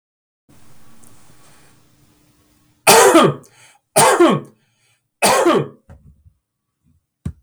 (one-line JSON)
{"three_cough_length": "7.4 s", "three_cough_amplitude": 32768, "three_cough_signal_mean_std_ratio": 0.38, "survey_phase": "beta (2021-08-13 to 2022-03-07)", "age": "45-64", "gender": "Male", "wearing_mask": "No", "symptom_none": true, "smoker_status": "Ex-smoker", "respiratory_condition_asthma": false, "respiratory_condition_other": false, "recruitment_source": "REACT", "submission_delay": "1 day", "covid_test_result": "Negative", "covid_test_method": "RT-qPCR", "influenza_a_test_result": "Negative", "influenza_b_test_result": "Negative"}